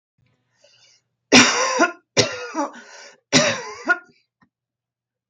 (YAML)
three_cough_length: 5.3 s
three_cough_amplitude: 32768
three_cough_signal_mean_std_ratio: 0.37
survey_phase: beta (2021-08-13 to 2022-03-07)
age: 45-64
gender: Female
wearing_mask: 'No'
symptom_none: true
smoker_status: Never smoked
respiratory_condition_asthma: false
respiratory_condition_other: false
recruitment_source: Test and Trace
submission_delay: 1 day
covid_test_result: Negative
covid_test_method: ePCR